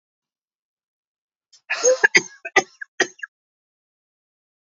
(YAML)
cough_length: 4.6 s
cough_amplitude: 28126
cough_signal_mean_std_ratio: 0.24
survey_phase: alpha (2021-03-01 to 2021-08-12)
age: 45-64
gender: Female
wearing_mask: 'No'
symptom_none: true
smoker_status: Never smoked
respiratory_condition_asthma: false
respiratory_condition_other: false
recruitment_source: REACT
submission_delay: 1 day
covid_test_result: Negative
covid_test_method: RT-qPCR